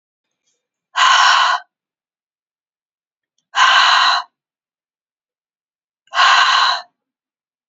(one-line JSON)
{"exhalation_length": "7.7 s", "exhalation_amplitude": 32767, "exhalation_signal_mean_std_ratio": 0.42, "survey_phase": "beta (2021-08-13 to 2022-03-07)", "age": "18-44", "gender": "Female", "wearing_mask": "No", "symptom_runny_or_blocked_nose": true, "symptom_shortness_of_breath": true, "symptom_sore_throat": true, "symptom_fatigue": true, "symptom_headache": true, "smoker_status": "Ex-smoker", "respiratory_condition_asthma": true, "respiratory_condition_other": false, "recruitment_source": "Test and Trace", "submission_delay": "2 days", "covid_test_result": "Positive", "covid_test_method": "RT-qPCR"}